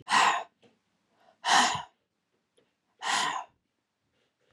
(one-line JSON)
{"exhalation_length": "4.5 s", "exhalation_amplitude": 11966, "exhalation_signal_mean_std_ratio": 0.38, "survey_phase": "beta (2021-08-13 to 2022-03-07)", "age": "45-64", "gender": "Male", "wearing_mask": "No", "symptom_cough_any": true, "symptom_runny_or_blocked_nose": true, "symptom_sore_throat": true, "symptom_fatigue": true, "symptom_fever_high_temperature": true, "symptom_headache": true, "symptom_onset": "2 days", "smoker_status": "Never smoked", "respiratory_condition_asthma": false, "respiratory_condition_other": false, "recruitment_source": "Test and Trace", "submission_delay": "2 days", "covid_test_result": "Positive", "covid_test_method": "RT-qPCR", "covid_ct_value": 18.0, "covid_ct_gene": "ORF1ab gene", "covid_ct_mean": 18.3, "covid_viral_load": "990000 copies/ml", "covid_viral_load_category": "Low viral load (10K-1M copies/ml)"}